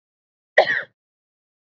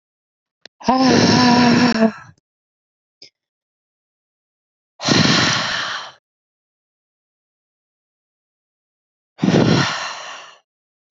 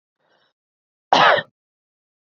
{"three_cough_length": "1.8 s", "three_cough_amplitude": 26798, "three_cough_signal_mean_std_ratio": 0.24, "exhalation_length": "11.2 s", "exhalation_amplitude": 27884, "exhalation_signal_mean_std_ratio": 0.42, "cough_length": "2.3 s", "cough_amplitude": 32768, "cough_signal_mean_std_ratio": 0.28, "survey_phase": "beta (2021-08-13 to 2022-03-07)", "age": "18-44", "gender": "Female", "wearing_mask": "Yes", "symptom_none": true, "smoker_status": "Never smoked", "respiratory_condition_asthma": false, "respiratory_condition_other": false, "recruitment_source": "REACT", "submission_delay": "1 day", "covid_test_result": "Negative", "covid_test_method": "RT-qPCR", "influenza_a_test_result": "Negative", "influenza_b_test_result": "Negative"}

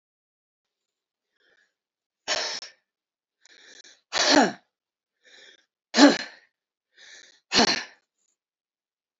{"exhalation_length": "9.2 s", "exhalation_amplitude": 25043, "exhalation_signal_mean_std_ratio": 0.25, "survey_phase": "beta (2021-08-13 to 2022-03-07)", "age": "65+", "gender": "Female", "wearing_mask": "No", "symptom_cough_any": true, "symptom_onset": "12 days", "smoker_status": "Never smoked", "respiratory_condition_asthma": true, "respiratory_condition_other": false, "recruitment_source": "REACT", "submission_delay": "5 days", "covid_test_result": "Negative", "covid_test_method": "RT-qPCR"}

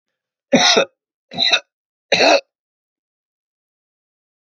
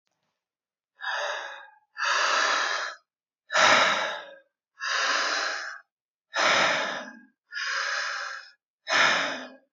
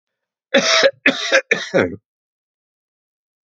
{"three_cough_length": "4.4 s", "three_cough_amplitude": 32767, "three_cough_signal_mean_std_ratio": 0.34, "exhalation_length": "9.7 s", "exhalation_amplitude": 20317, "exhalation_signal_mean_std_ratio": 0.6, "cough_length": "3.5 s", "cough_amplitude": 32545, "cough_signal_mean_std_ratio": 0.4, "survey_phase": "alpha (2021-03-01 to 2021-08-12)", "age": "65+", "gender": "Male", "wearing_mask": "No", "symptom_none": true, "smoker_status": "Ex-smoker", "respiratory_condition_asthma": true, "respiratory_condition_other": false, "recruitment_source": "REACT", "submission_delay": "4 days", "covid_test_result": "Negative", "covid_test_method": "RT-qPCR"}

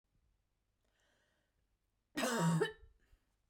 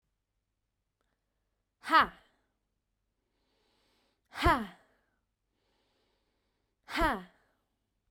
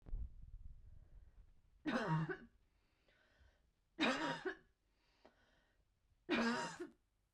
{"cough_length": "3.5 s", "cough_amplitude": 2452, "cough_signal_mean_std_ratio": 0.34, "exhalation_length": "8.1 s", "exhalation_amplitude": 8196, "exhalation_signal_mean_std_ratio": 0.22, "three_cough_length": "7.3 s", "three_cough_amplitude": 1802, "three_cough_signal_mean_std_ratio": 0.45, "survey_phase": "beta (2021-08-13 to 2022-03-07)", "age": "18-44", "gender": "Female", "wearing_mask": "No", "symptom_sore_throat": true, "symptom_onset": "13 days", "smoker_status": "Never smoked", "respiratory_condition_asthma": false, "respiratory_condition_other": false, "recruitment_source": "REACT", "submission_delay": "8 days", "covid_test_result": "Negative", "covid_test_method": "RT-qPCR", "influenza_a_test_result": "Negative", "influenza_b_test_result": "Negative"}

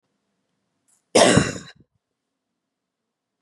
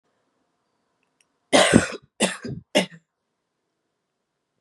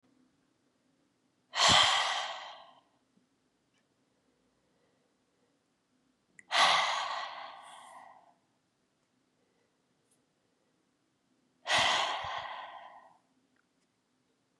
{"cough_length": "3.4 s", "cough_amplitude": 29728, "cough_signal_mean_std_ratio": 0.25, "three_cough_length": "4.6 s", "three_cough_amplitude": 32767, "three_cough_signal_mean_std_ratio": 0.27, "exhalation_length": "14.6 s", "exhalation_amplitude": 9345, "exhalation_signal_mean_std_ratio": 0.32, "survey_phase": "beta (2021-08-13 to 2022-03-07)", "age": "18-44", "gender": "Female", "wearing_mask": "No", "symptom_cough_any": true, "symptom_runny_or_blocked_nose": true, "symptom_sore_throat": true, "symptom_fatigue": true, "symptom_fever_high_temperature": true, "symptom_other": true, "symptom_onset": "4 days", "smoker_status": "Never smoked", "respiratory_condition_asthma": false, "respiratory_condition_other": false, "recruitment_source": "Test and Trace", "submission_delay": "2 days", "covid_test_result": "Positive", "covid_test_method": "RT-qPCR", "covid_ct_value": 20.1, "covid_ct_gene": "ORF1ab gene", "covid_ct_mean": 20.3, "covid_viral_load": "220000 copies/ml", "covid_viral_load_category": "Low viral load (10K-1M copies/ml)"}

